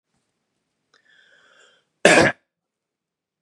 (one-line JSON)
{"cough_length": "3.4 s", "cough_amplitude": 32433, "cough_signal_mean_std_ratio": 0.22, "survey_phase": "beta (2021-08-13 to 2022-03-07)", "age": "18-44", "gender": "Male", "wearing_mask": "No", "symptom_cough_any": true, "symptom_sore_throat": true, "smoker_status": "Never smoked", "respiratory_condition_asthma": false, "respiratory_condition_other": false, "recruitment_source": "Test and Trace", "submission_delay": "2 days", "covid_test_result": "Positive", "covid_test_method": "RT-qPCR", "covid_ct_value": 29.8, "covid_ct_gene": "N gene"}